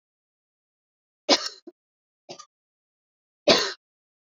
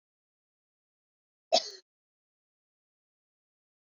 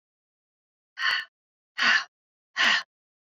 {"three_cough_length": "4.4 s", "three_cough_amplitude": 23171, "three_cough_signal_mean_std_ratio": 0.22, "cough_length": "3.8 s", "cough_amplitude": 10029, "cough_signal_mean_std_ratio": 0.13, "exhalation_length": "3.3 s", "exhalation_amplitude": 12307, "exhalation_signal_mean_std_ratio": 0.37, "survey_phase": "beta (2021-08-13 to 2022-03-07)", "age": "45-64", "gender": "Female", "wearing_mask": "No", "symptom_runny_or_blocked_nose": true, "symptom_headache": true, "symptom_onset": "3 days", "smoker_status": "Never smoked", "respiratory_condition_asthma": false, "respiratory_condition_other": false, "recruitment_source": "Test and Trace", "submission_delay": "2 days", "covid_test_result": "Positive", "covid_test_method": "RT-qPCR", "covid_ct_value": 21.6, "covid_ct_gene": "ORF1ab gene", "covid_ct_mean": 22.7, "covid_viral_load": "37000 copies/ml", "covid_viral_load_category": "Low viral load (10K-1M copies/ml)"}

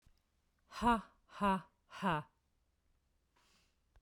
{"exhalation_length": "4.0 s", "exhalation_amplitude": 2813, "exhalation_signal_mean_std_ratio": 0.34, "survey_phase": "beta (2021-08-13 to 2022-03-07)", "age": "45-64", "gender": "Female", "wearing_mask": "No", "symptom_none": true, "smoker_status": "Never smoked", "respiratory_condition_asthma": false, "respiratory_condition_other": false, "recruitment_source": "REACT", "submission_delay": "1 day", "covid_test_result": "Negative", "covid_test_method": "RT-qPCR", "influenza_a_test_result": "Negative", "influenza_b_test_result": "Negative"}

